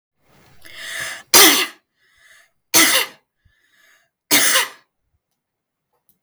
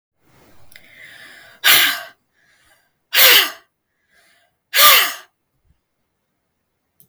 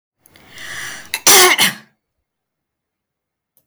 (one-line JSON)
{"three_cough_length": "6.2 s", "three_cough_amplitude": 32768, "three_cough_signal_mean_std_ratio": 0.34, "exhalation_length": "7.1 s", "exhalation_amplitude": 32768, "exhalation_signal_mean_std_ratio": 0.31, "cough_length": "3.7 s", "cough_amplitude": 32768, "cough_signal_mean_std_ratio": 0.33, "survey_phase": "beta (2021-08-13 to 2022-03-07)", "age": "45-64", "gender": "Female", "wearing_mask": "No", "symptom_cough_any": true, "smoker_status": "Never smoked", "respiratory_condition_asthma": false, "respiratory_condition_other": false, "recruitment_source": "Test and Trace", "submission_delay": "2 days", "covid_test_result": "Positive", "covid_test_method": "ePCR"}